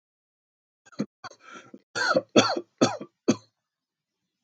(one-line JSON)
{"cough_length": "4.4 s", "cough_amplitude": 21169, "cough_signal_mean_std_ratio": 0.3, "survey_phase": "beta (2021-08-13 to 2022-03-07)", "age": "45-64", "gender": "Male", "wearing_mask": "No", "symptom_none": true, "smoker_status": "Never smoked", "respiratory_condition_asthma": false, "respiratory_condition_other": false, "recruitment_source": "Test and Trace", "submission_delay": "0 days", "covid_test_result": "Negative", "covid_test_method": "LFT"}